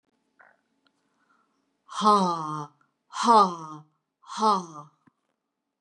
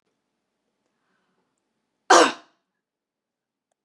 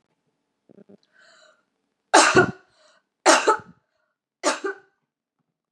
exhalation_length: 5.8 s
exhalation_amplitude: 15821
exhalation_signal_mean_std_ratio: 0.35
cough_length: 3.8 s
cough_amplitude: 29279
cough_signal_mean_std_ratio: 0.18
three_cough_length: 5.7 s
three_cough_amplitude: 31242
three_cough_signal_mean_std_ratio: 0.28
survey_phase: beta (2021-08-13 to 2022-03-07)
age: 45-64
gender: Female
wearing_mask: 'No'
symptom_runny_or_blocked_nose: true
symptom_fatigue: true
smoker_status: Never smoked
respiratory_condition_asthma: false
respiratory_condition_other: false
recruitment_source: Test and Trace
submission_delay: 2 days
covid_test_result: Positive
covid_test_method: RT-qPCR
covid_ct_value: 22.4
covid_ct_gene: N gene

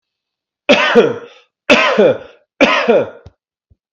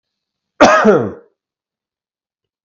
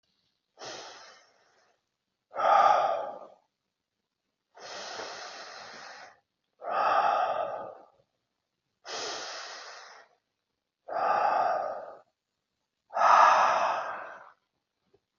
three_cough_length: 3.9 s
three_cough_amplitude: 32768
three_cough_signal_mean_std_ratio: 0.5
cough_length: 2.6 s
cough_amplitude: 32768
cough_signal_mean_std_ratio: 0.34
exhalation_length: 15.2 s
exhalation_amplitude: 13344
exhalation_signal_mean_std_ratio: 0.43
survey_phase: beta (2021-08-13 to 2022-03-07)
age: 45-64
gender: Male
wearing_mask: 'No'
symptom_none: true
smoker_status: Ex-smoker
respiratory_condition_asthma: false
respiratory_condition_other: false
recruitment_source: REACT
submission_delay: 1 day
covid_test_result: Negative
covid_test_method: RT-qPCR
influenza_a_test_result: Negative
influenza_b_test_result: Negative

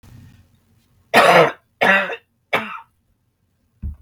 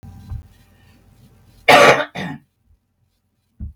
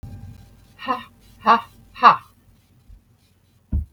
three_cough_length: 4.0 s
three_cough_amplitude: 32768
three_cough_signal_mean_std_ratio: 0.37
cough_length: 3.8 s
cough_amplitude: 32768
cough_signal_mean_std_ratio: 0.29
exhalation_length: 3.9 s
exhalation_amplitude: 32768
exhalation_signal_mean_std_ratio: 0.29
survey_phase: beta (2021-08-13 to 2022-03-07)
age: 45-64
gender: Female
wearing_mask: 'No'
symptom_none: true
smoker_status: Never smoked
respiratory_condition_asthma: false
respiratory_condition_other: false
recruitment_source: REACT
submission_delay: 3 days
covid_test_result: Negative
covid_test_method: RT-qPCR
influenza_a_test_result: Negative
influenza_b_test_result: Negative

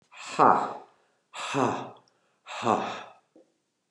exhalation_length: 3.9 s
exhalation_amplitude: 18580
exhalation_signal_mean_std_ratio: 0.39
survey_phase: beta (2021-08-13 to 2022-03-07)
age: 45-64
gender: Male
wearing_mask: 'No'
symptom_cough_any: true
symptom_runny_or_blocked_nose: true
symptom_sore_throat: true
symptom_onset: 2 days
smoker_status: Never smoked
respiratory_condition_asthma: false
respiratory_condition_other: false
recruitment_source: Test and Trace
submission_delay: 1 day
covid_test_result: Positive
covid_test_method: RT-qPCR
covid_ct_value: 20.1
covid_ct_gene: ORF1ab gene
covid_ct_mean: 20.2
covid_viral_load: 240000 copies/ml
covid_viral_load_category: Low viral load (10K-1M copies/ml)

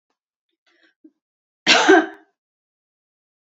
cough_length: 3.5 s
cough_amplitude: 29874
cough_signal_mean_std_ratio: 0.26
survey_phase: beta (2021-08-13 to 2022-03-07)
age: 18-44
gender: Female
wearing_mask: 'No'
symptom_headache: true
smoker_status: Never smoked
respiratory_condition_asthma: false
respiratory_condition_other: false
recruitment_source: REACT
submission_delay: 1 day
covid_test_result: Negative
covid_test_method: RT-qPCR
influenza_a_test_result: Negative
influenza_b_test_result: Negative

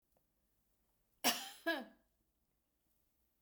cough_length: 3.4 s
cough_amplitude: 4294
cough_signal_mean_std_ratio: 0.26
survey_phase: beta (2021-08-13 to 2022-03-07)
age: 65+
gender: Female
wearing_mask: 'No'
symptom_fatigue: true
symptom_headache: true
smoker_status: Never smoked
respiratory_condition_asthma: false
respiratory_condition_other: false
recruitment_source: REACT
submission_delay: 1 day
covid_test_result: Negative
covid_test_method: RT-qPCR
influenza_a_test_result: Negative
influenza_b_test_result: Negative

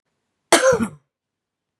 cough_length: 1.8 s
cough_amplitude: 32767
cough_signal_mean_std_ratio: 0.34
survey_phase: beta (2021-08-13 to 2022-03-07)
age: 45-64
gender: Female
wearing_mask: 'No'
symptom_cough_any: true
symptom_runny_or_blocked_nose: true
symptom_sore_throat: true
symptom_headache: true
symptom_change_to_sense_of_smell_or_taste: true
symptom_loss_of_taste: true
symptom_onset: 4 days
smoker_status: Never smoked
respiratory_condition_asthma: false
respiratory_condition_other: false
recruitment_source: Test and Trace
submission_delay: 1 day
covid_test_result: Positive
covid_test_method: RT-qPCR
covid_ct_value: 20.1
covid_ct_gene: ORF1ab gene
covid_ct_mean: 20.5
covid_viral_load: 180000 copies/ml
covid_viral_load_category: Low viral load (10K-1M copies/ml)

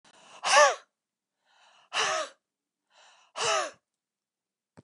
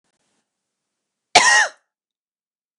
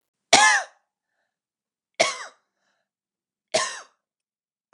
exhalation_length: 4.8 s
exhalation_amplitude: 15392
exhalation_signal_mean_std_ratio: 0.32
cough_length: 2.8 s
cough_amplitude: 32768
cough_signal_mean_std_ratio: 0.27
three_cough_length: 4.7 s
three_cough_amplitude: 32767
three_cough_signal_mean_std_ratio: 0.27
survey_phase: beta (2021-08-13 to 2022-03-07)
age: 65+
gender: Female
wearing_mask: 'No'
symptom_cough_any: true
smoker_status: Never smoked
respiratory_condition_asthma: false
respiratory_condition_other: false
recruitment_source: REACT
submission_delay: 3 days
covid_test_result: Negative
covid_test_method: RT-qPCR
influenza_a_test_result: Negative
influenza_b_test_result: Negative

